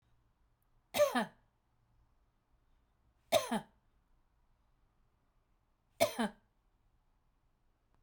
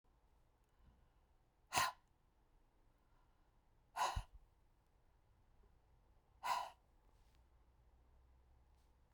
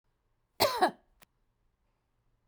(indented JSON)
{
  "three_cough_length": "8.0 s",
  "three_cough_amplitude": 5857,
  "three_cough_signal_mean_std_ratio": 0.24,
  "exhalation_length": "9.1 s",
  "exhalation_amplitude": 3468,
  "exhalation_signal_mean_std_ratio": 0.27,
  "cough_length": "2.5 s",
  "cough_amplitude": 9592,
  "cough_signal_mean_std_ratio": 0.26,
  "survey_phase": "beta (2021-08-13 to 2022-03-07)",
  "age": "45-64",
  "gender": "Female",
  "wearing_mask": "No",
  "symptom_none": true,
  "smoker_status": "Ex-smoker",
  "respiratory_condition_asthma": false,
  "respiratory_condition_other": false,
  "recruitment_source": "REACT",
  "submission_delay": "2 days",
  "covid_test_result": "Negative",
  "covid_test_method": "RT-qPCR"
}